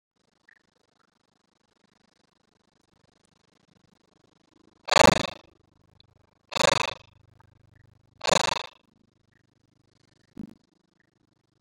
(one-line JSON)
{"exhalation_length": "11.6 s", "exhalation_amplitude": 32597, "exhalation_signal_mean_std_ratio": 0.17, "survey_phase": "beta (2021-08-13 to 2022-03-07)", "age": "65+", "gender": "Male", "wearing_mask": "No", "symptom_none": true, "smoker_status": "Never smoked", "respiratory_condition_asthma": false, "respiratory_condition_other": false, "recruitment_source": "REACT", "submission_delay": "2 days", "covid_test_result": "Negative", "covid_test_method": "RT-qPCR", "influenza_a_test_result": "Negative", "influenza_b_test_result": "Negative"}